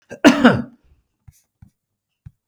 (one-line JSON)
{"cough_length": "2.5 s", "cough_amplitude": 32768, "cough_signal_mean_std_ratio": 0.28, "survey_phase": "beta (2021-08-13 to 2022-03-07)", "age": "65+", "gender": "Male", "wearing_mask": "No", "symptom_none": true, "smoker_status": "Ex-smoker", "respiratory_condition_asthma": false, "respiratory_condition_other": false, "recruitment_source": "REACT", "submission_delay": "2 days", "covid_test_result": "Positive", "covid_test_method": "RT-qPCR", "covid_ct_value": 31.7, "covid_ct_gene": "E gene", "influenza_a_test_result": "Negative", "influenza_b_test_result": "Negative"}